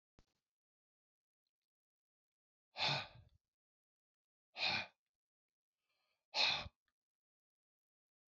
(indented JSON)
{
  "exhalation_length": "8.3 s",
  "exhalation_amplitude": 2585,
  "exhalation_signal_mean_std_ratio": 0.25,
  "survey_phase": "beta (2021-08-13 to 2022-03-07)",
  "age": "65+",
  "gender": "Male",
  "wearing_mask": "No",
  "symptom_none": true,
  "smoker_status": "Ex-smoker",
  "respiratory_condition_asthma": false,
  "respiratory_condition_other": false,
  "recruitment_source": "REACT",
  "submission_delay": "3 days",
  "covid_test_result": "Negative",
  "covid_test_method": "RT-qPCR",
  "influenza_a_test_result": "Negative",
  "influenza_b_test_result": "Negative"
}